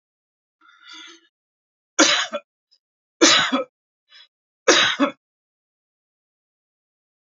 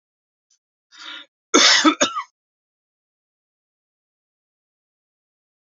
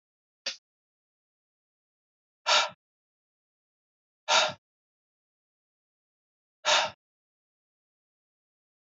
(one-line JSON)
{"three_cough_length": "7.3 s", "three_cough_amplitude": 30426, "three_cough_signal_mean_std_ratio": 0.3, "cough_length": "5.7 s", "cough_amplitude": 28623, "cough_signal_mean_std_ratio": 0.24, "exhalation_length": "8.9 s", "exhalation_amplitude": 12442, "exhalation_signal_mean_std_ratio": 0.22, "survey_phase": "beta (2021-08-13 to 2022-03-07)", "age": "45-64", "gender": "Male", "wearing_mask": "No", "symptom_runny_or_blocked_nose": true, "smoker_status": "Ex-smoker", "respiratory_condition_asthma": false, "respiratory_condition_other": false, "recruitment_source": "REACT", "submission_delay": "1 day", "covid_test_result": "Negative", "covid_test_method": "RT-qPCR"}